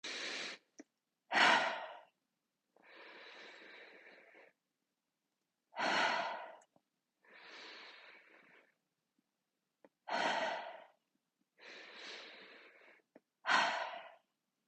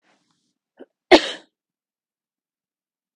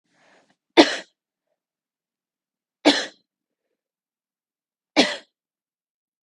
{
  "exhalation_length": "14.7 s",
  "exhalation_amplitude": 5377,
  "exhalation_signal_mean_std_ratio": 0.36,
  "cough_length": "3.2 s",
  "cough_amplitude": 32768,
  "cough_signal_mean_std_ratio": 0.14,
  "three_cough_length": "6.2 s",
  "three_cough_amplitude": 32768,
  "three_cough_signal_mean_std_ratio": 0.19,
  "survey_phase": "beta (2021-08-13 to 2022-03-07)",
  "age": "45-64",
  "gender": "Female",
  "wearing_mask": "No",
  "symptom_fatigue": true,
  "smoker_status": "Never smoked",
  "respiratory_condition_asthma": false,
  "respiratory_condition_other": false,
  "recruitment_source": "REACT",
  "submission_delay": "4 days",
  "covid_test_result": "Negative",
  "covid_test_method": "RT-qPCR",
  "influenza_a_test_result": "Unknown/Void",
  "influenza_b_test_result": "Unknown/Void"
}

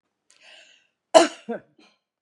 {
  "cough_length": "2.2 s",
  "cough_amplitude": 32768,
  "cough_signal_mean_std_ratio": 0.21,
  "survey_phase": "beta (2021-08-13 to 2022-03-07)",
  "age": "65+",
  "gender": "Female",
  "wearing_mask": "No",
  "symptom_none": true,
  "smoker_status": "Never smoked",
  "respiratory_condition_asthma": false,
  "respiratory_condition_other": false,
  "recruitment_source": "REACT",
  "submission_delay": "2 days",
  "covid_test_result": "Negative",
  "covid_test_method": "RT-qPCR",
  "influenza_a_test_result": "Negative",
  "influenza_b_test_result": "Negative"
}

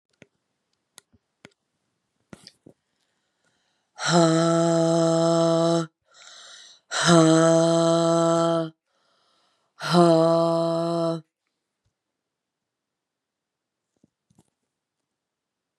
{
  "exhalation_length": "15.8 s",
  "exhalation_amplitude": 24996,
  "exhalation_signal_mean_std_ratio": 0.44,
  "survey_phase": "beta (2021-08-13 to 2022-03-07)",
  "age": "45-64",
  "gender": "Female",
  "wearing_mask": "No",
  "symptom_runny_or_blocked_nose": true,
  "symptom_sore_throat": true,
  "symptom_onset": "4 days",
  "smoker_status": "Never smoked",
  "respiratory_condition_asthma": false,
  "respiratory_condition_other": false,
  "recruitment_source": "Test and Trace",
  "submission_delay": "1 day",
  "covid_test_result": "Positive",
  "covid_test_method": "ePCR"
}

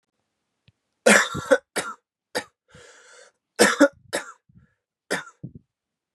{
  "three_cough_length": "6.1 s",
  "three_cough_amplitude": 31175,
  "three_cough_signal_mean_std_ratio": 0.28,
  "survey_phase": "beta (2021-08-13 to 2022-03-07)",
  "age": "18-44",
  "gender": "Male",
  "wearing_mask": "No",
  "symptom_runny_or_blocked_nose": true,
  "symptom_loss_of_taste": true,
  "symptom_other": true,
  "smoker_status": "Never smoked",
  "respiratory_condition_asthma": false,
  "respiratory_condition_other": false,
  "recruitment_source": "Test and Trace",
  "submission_delay": "1 day",
  "covid_test_result": "Positive",
  "covid_test_method": "RT-qPCR",
  "covid_ct_value": 18.9,
  "covid_ct_gene": "ORF1ab gene"
}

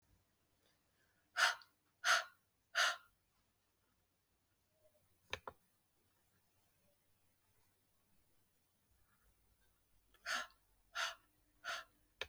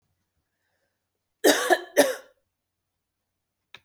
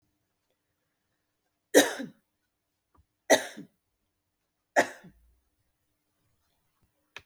{
  "exhalation_length": "12.3 s",
  "exhalation_amplitude": 3511,
  "exhalation_signal_mean_std_ratio": 0.24,
  "cough_length": "3.8 s",
  "cough_amplitude": 20965,
  "cough_signal_mean_std_ratio": 0.26,
  "three_cough_length": "7.3 s",
  "three_cough_amplitude": 20999,
  "three_cough_signal_mean_std_ratio": 0.18,
  "survey_phase": "beta (2021-08-13 to 2022-03-07)",
  "age": "45-64",
  "gender": "Female",
  "wearing_mask": "No",
  "symptom_cough_any": true,
  "symptom_new_continuous_cough": true,
  "symptom_runny_or_blocked_nose": true,
  "symptom_sore_throat": true,
  "symptom_fatigue": true,
  "smoker_status": "Never smoked",
  "respiratory_condition_asthma": false,
  "respiratory_condition_other": false,
  "recruitment_source": "Test and Trace",
  "submission_delay": "1 day",
  "covid_test_result": "Positive",
  "covid_test_method": "RT-qPCR",
  "covid_ct_value": 31.7,
  "covid_ct_gene": "ORF1ab gene",
  "covid_ct_mean": 32.4,
  "covid_viral_load": "23 copies/ml",
  "covid_viral_load_category": "Minimal viral load (< 10K copies/ml)"
}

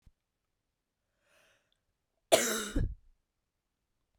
{
  "cough_length": "4.2 s",
  "cough_amplitude": 13282,
  "cough_signal_mean_std_ratio": 0.25,
  "survey_phase": "beta (2021-08-13 to 2022-03-07)",
  "age": "18-44",
  "gender": "Female",
  "wearing_mask": "No",
  "symptom_runny_or_blocked_nose": true,
  "symptom_fatigue": true,
  "symptom_headache": true,
  "symptom_change_to_sense_of_smell_or_taste": true,
  "symptom_loss_of_taste": true,
  "smoker_status": "Never smoked",
  "respiratory_condition_asthma": true,
  "respiratory_condition_other": false,
  "recruitment_source": "Test and Trace",
  "submission_delay": "2 days",
  "covid_test_result": "Positive",
  "covid_test_method": "RT-qPCR",
  "covid_ct_value": 8.0,
  "covid_ct_gene": "N gene"
}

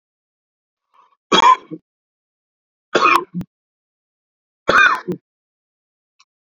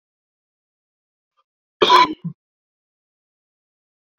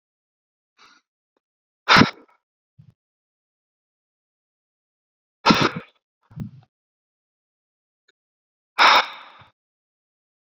{
  "three_cough_length": "6.6 s",
  "three_cough_amplitude": 28269,
  "three_cough_signal_mean_std_ratio": 0.29,
  "cough_length": "4.2 s",
  "cough_amplitude": 27269,
  "cough_signal_mean_std_ratio": 0.21,
  "exhalation_length": "10.4 s",
  "exhalation_amplitude": 27516,
  "exhalation_signal_mean_std_ratio": 0.21,
  "survey_phase": "beta (2021-08-13 to 2022-03-07)",
  "age": "18-44",
  "gender": "Male",
  "wearing_mask": "No",
  "symptom_fatigue": true,
  "symptom_onset": "12 days",
  "smoker_status": "Current smoker (1 to 10 cigarettes per day)",
  "respiratory_condition_asthma": false,
  "respiratory_condition_other": false,
  "recruitment_source": "REACT",
  "submission_delay": "3 days",
  "covid_test_result": "Negative",
  "covid_test_method": "RT-qPCR"
}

